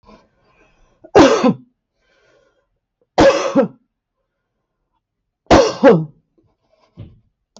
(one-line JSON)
{"three_cough_length": "7.6 s", "three_cough_amplitude": 32768, "three_cough_signal_mean_std_ratio": 0.33, "survey_phase": "beta (2021-08-13 to 2022-03-07)", "age": "65+", "gender": "Female", "wearing_mask": "No", "symptom_none": true, "smoker_status": "Ex-smoker", "respiratory_condition_asthma": false, "respiratory_condition_other": false, "recruitment_source": "REACT", "submission_delay": "1 day", "covid_test_result": "Negative", "covid_test_method": "RT-qPCR", "influenza_a_test_result": "Negative", "influenza_b_test_result": "Negative"}